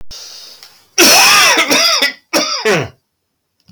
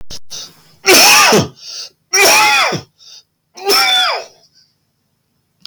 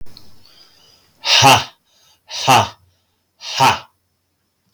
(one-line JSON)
{"cough_length": "3.7 s", "cough_amplitude": 32768, "cough_signal_mean_std_ratio": 0.65, "three_cough_length": "5.7 s", "three_cough_amplitude": 32768, "three_cough_signal_mean_std_ratio": 0.58, "exhalation_length": "4.7 s", "exhalation_amplitude": 32767, "exhalation_signal_mean_std_ratio": 0.38, "survey_phase": "beta (2021-08-13 to 2022-03-07)", "age": "45-64", "gender": "Male", "wearing_mask": "No", "symptom_cough_any": true, "symptom_fatigue": true, "symptom_headache": true, "smoker_status": "Ex-smoker", "respiratory_condition_asthma": false, "respiratory_condition_other": false, "recruitment_source": "Test and Trace", "submission_delay": "1 day", "covid_test_result": "Positive", "covid_test_method": "ePCR"}